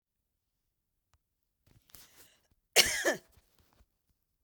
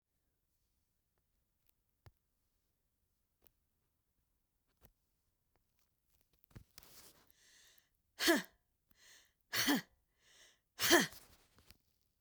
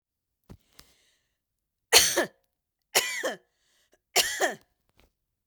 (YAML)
cough_length: 4.4 s
cough_amplitude: 12943
cough_signal_mean_std_ratio: 0.2
exhalation_length: 12.2 s
exhalation_amplitude: 5407
exhalation_signal_mean_std_ratio: 0.21
three_cough_length: 5.5 s
three_cough_amplitude: 29859
three_cough_signal_mean_std_ratio: 0.29
survey_phase: beta (2021-08-13 to 2022-03-07)
age: 65+
gender: Female
wearing_mask: 'No'
symptom_fatigue: true
smoker_status: Never smoked
respiratory_condition_asthma: true
respiratory_condition_other: false
recruitment_source: REACT
submission_delay: 1 day
covid_test_result: Negative
covid_test_method: RT-qPCR
influenza_a_test_result: Negative
influenza_b_test_result: Negative